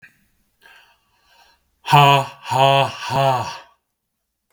{"exhalation_length": "4.5 s", "exhalation_amplitude": 32768, "exhalation_signal_mean_std_ratio": 0.4, "survey_phase": "beta (2021-08-13 to 2022-03-07)", "age": "18-44", "gender": "Male", "wearing_mask": "No", "symptom_runny_or_blocked_nose": true, "symptom_onset": "3 days", "smoker_status": "Never smoked", "respiratory_condition_asthma": false, "respiratory_condition_other": false, "recruitment_source": "REACT", "submission_delay": "1 day", "covid_test_result": "Negative", "covid_test_method": "RT-qPCR", "influenza_a_test_result": "Unknown/Void", "influenza_b_test_result": "Unknown/Void"}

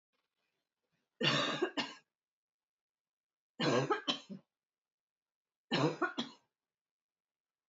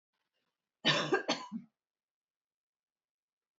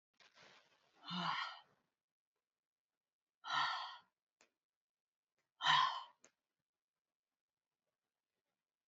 {"three_cough_length": "7.7 s", "three_cough_amplitude": 3987, "three_cough_signal_mean_std_ratio": 0.35, "cough_length": "3.6 s", "cough_amplitude": 5679, "cough_signal_mean_std_ratio": 0.29, "exhalation_length": "8.9 s", "exhalation_amplitude": 3596, "exhalation_signal_mean_std_ratio": 0.28, "survey_phase": "beta (2021-08-13 to 2022-03-07)", "age": "45-64", "gender": "Female", "wearing_mask": "No", "symptom_none": true, "smoker_status": "Never smoked", "respiratory_condition_asthma": false, "respiratory_condition_other": false, "recruitment_source": "REACT", "submission_delay": "0 days", "covid_test_result": "Negative", "covid_test_method": "RT-qPCR"}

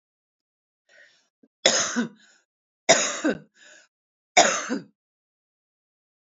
{"three_cough_length": "6.3 s", "three_cough_amplitude": 29805, "three_cough_signal_mean_std_ratio": 0.3, "survey_phase": "beta (2021-08-13 to 2022-03-07)", "age": "18-44", "gender": "Female", "wearing_mask": "No", "symptom_runny_or_blocked_nose": true, "symptom_headache": true, "smoker_status": "Current smoker (1 to 10 cigarettes per day)", "respiratory_condition_asthma": false, "respiratory_condition_other": false, "recruitment_source": "REACT", "submission_delay": "1 day", "covid_test_result": "Positive", "covid_test_method": "RT-qPCR", "covid_ct_value": 27.0, "covid_ct_gene": "E gene", "influenza_a_test_result": "Unknown/Void", "influenza_b_test_result": "Unknown/Void"}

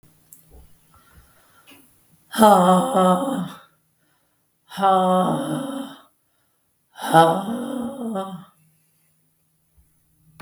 {"exhalation_length": "10.4 s", "exhalation_amplitude": 32766, "exhalation_signal_mean_std_ratio": 0.42, "survey_phase": "beta (2021-08-13 to 2022-03-07)", "age": "45-64", "gender": "Female", "wearing_mask": "No", "symptom_fatigue": true, "symptom_headache": true, "smoker_status": "Never smoked", "respiratory_condition_asthma": false, "respiratory_condition_other": false, "recruitment_source": "Test and Trace", "submission_delay": "1 day", "covid_test_result": "Positive", "covid_test_method": "RT-qPCR", "covid_ct_value": 26.3, "covid_ct_gene": "N gene"}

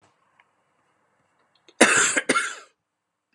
{"cough_length": "3.3 s", "cough_amplitude": 32574, "cough_signal_mean_std_ratio": 0.32, "survey_phase": "beta (2021-08-13 to 2022-03-07)", "age": "18-44", "gender": "Male", "wearing_mask": "No", "symptom_cough_any": true, "symptom_new_continuous_cough": true, "symptom_runny_or_blocked_nose": true, "symptom_sore_throat": true, "symptom_fatigue": true, "symptom_fever_high_temperature": true, "symptom_onset": "4 days", "smoker_status": "Never smoked", "respiratory_condition_asthma": false, "respiratory_condition_other": false, "recruitment_source": "REACT", "submission_delay": "0 days", "covid_test_result": "Negative", "covid_test_method": "RT-qPCR", "influenza_a_test_result": "Unknown/Void", "influenza_b_test_result": "Unknown/Void"}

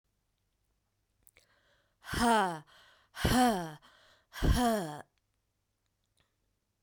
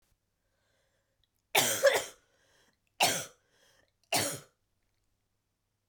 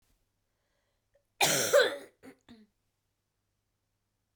{"exhalation_length": "6.8 s", "exhalation_amplitude": 5722, "exhalation_signal_mean_std_ratio": 0.37, "three_cough_length": "5.9 s", "three_cough_amplitude": 9041, "three_cough_signal_mean_std_ratio": 0.3, "cough_length": "4.4 s", "cough_amplitude": 8296, "cough_signal_mean_std_ratio": 0.27, "survey_phase": "beta (2021-08-13 to 2022-03-07)", "age": "18-44", "gender": "Female", "wearing_mask": "No", "symptom_cough_any": true, "symptom_runny_or_blocked_nose": true, "symptom_shortness_of_breath": true, "symptom_sore_throat": true, "symptom_fatigue": true, "symptom_headache": true, "symptom_onset": "4 days", "smoker_status": "Ex-smoker", "respiratory_condition_asthma": true, "respiratory_condition_other": false, "recruitment_source": "Test and Trace", "submission_delay": "1 day", "covid_test_result": "Positive", "covid_test_method": "RT-qPCR", "covid_ct_value": 15.6, "covid_ct_gene": "ORF1ab gene", "covid_ct_mean": 15.9, "covid_viral_load": "5900000 copies/ml", "covid_viral_load_category": "High viral load (>1M copies/ml)"}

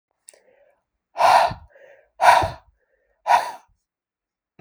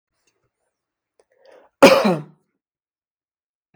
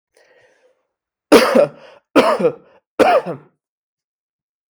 {"exhalation_length": "4.6 s", "exhalation_amplitude": 32768, "exhalation_signal_mean_std_ratio": 0.33, "cough_length": "3.8 s", "cough_amplitude": 32768, "cough_signal_mean_std_ratio": 0.22, "three_cough_length": "4.7 s", "three_cough_amplitude": 32768, "three_cough_signal_mean_std_ratio": 0.36, "survey_phase": "beta (2021-08-13 to 2022-03-07)", "age": "18-44", "gender": "Male", "wearing_mask": "No", "symptom_none": true, "smoker_status": "Never smoked", "respiratory_condition_asthma": false, "respiratory_condition_other": false, "recruitment_source": "REACT", "submission_delay": "2 days", "covid_test_result": "Negative", "covid_test_method": "RT-qPCR", "influenza_a_test_result": "Negative", "influenza_b_test_result": "Negative"}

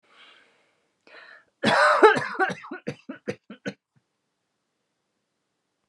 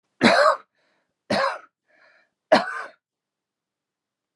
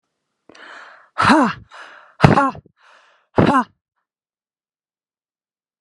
{"cough_length": "5.9 s", "cough_amplitude": 27501, "cough_signal_mean_std_ratio": 0.3, "three_cough_length": "4.4 s", "three_cough_amplitude": 27260, "three_cough_signal_mean_std_ratio": 0.33, "exhalation_length": "5.8 s", "exhalation_amplitude": 32768, "exhalation_signal_mean_std_ratio": 0.31, "survey_phase": "alpha (2021-03-01 to 2021-08-12)", "age": "18-44", "gender": "Female", "wearing_mask": "No", "symptom_none": true, "smoker_status": "Ex-smoker", "respiratory_condition_asthma": false, "respiratory_condition_other": false, "recruitment_source": "REACT", "submission_delay": "1 day", "covid_test_result": "Negative", "covid_test_method": "RT-qPCR"}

